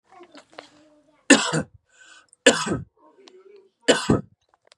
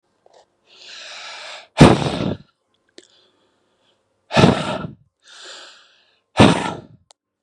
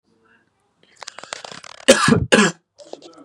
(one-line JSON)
{"three_cough_length": "4.8 s", "three_cough_amplitude": 32003, "three_cough_signal_mean_std_ratio": 0.3, "exhalation_length": "7.4 s", "exhalation_amplitude": 32768, "exhalation_signal_mean_std_ratio": 0.3, "cough_length": "3.2 s", "cough_amplitude": 32768, "cough_signal_mean_std_ratio": 0.33, "survey_phase": "beta (2021-08-13 to 2022-03-07)", "age": "18-44", "gender": "Male", "wearing_mask": "No", "symptom_none": true, "smoker_status": "Never smoked", "respiratory_condition_asthma": false, "respiratory_condition_other": false, "recruitment_source": "REACT", "submission_delay": "2 days", "covid_test_result": "Negative", "covid_test_method": "RT-qPCR", "influenza_a_test_result": "Negative", "influenza_b_test_result": "Negative"}